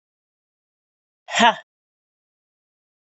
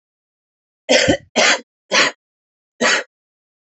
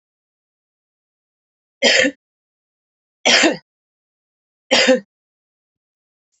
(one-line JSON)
{"exhalation_length": "3.2 s", "exhalation_amplitude": 29497, "exhalation_signal_mean_std_ratio": 0.19, "cough_length": "3.8 s", "cough_amplitude": 28945, "cough_signal_mean_std_ratio": 0.4, "three_cough_length": "6.4 s", "three_cough_amplitude": 32767, "three_cough_signal_mean_std_ratio": 0.29, "survey_phase": "alpha (2021-03-01 to 2021-08-12)", "age": "45-64", "gender": "Female", "wearing_mask": "No", "symptom_cough_any": true, "symptom_fatigue": true, "symptom_fever_high_temperature": true, "symptom_headache": true, "symptom_onset": "4 days", "smoker_status": "Current smoker (11 or more cigarettes per day)", "respiratory_condition_asthma": false, "respiratory_condition_other": false, "recruitment_source": "Test and Trace", "submission_delay": "2 days", "covid_test_result": "Positive", "covid_test_method": "RT-qPCR"}